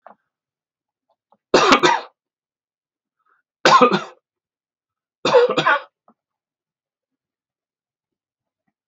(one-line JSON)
{"three_cough_length": "8.9 s", "three_cough_amplitude": 32768, "three_cough_signal_mean_std_ratio": 0.29, "survey_phase": "beta (2021-08-13 to 2022-03-07)", "age": "65+", "gender": "Male", "wearing_mask": "No", "symptom_none": true, "smoker_status": "Never smoked", "respiratory_condition_asthma": false, "respiratory_condition_other": false, "recruitment_source": "REACT", "submission_delay": "1 day", "covid_test_result": "Negative", "covid_test_method": "RT-qPCR"}